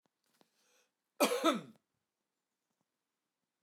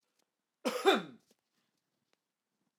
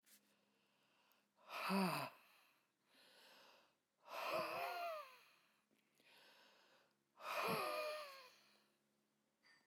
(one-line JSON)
{"three_cough_length": "3.6 s", "three_cough_amplitude": 6044, "three_cough_signal_mean_std_ratio": 0.24, "cough_length": "2.8 s", "cough_amplitude": 7516, "cough_signal_mean_std_ratio": 0.24, "exhalation_length": "9.7 s", "exhalation_amplitude": 1082, "exhalation_signal_mean_std_ratio": 0.45, "survey_phase": "alpha (2021-03-01 to 2021-08-12)", "age": "65+", "gender": "Male", "wearing_mask": "No", "symptom_none": true, "smoker_status": "Never smoked", "respiratory_condition_asthma": false, "respiratory_condition_other": false, "recruitment_source": "REACT", "submission_delay": "1 day", "covid_test_result": "Negative", "covid_test_method": "RT-qPCR"}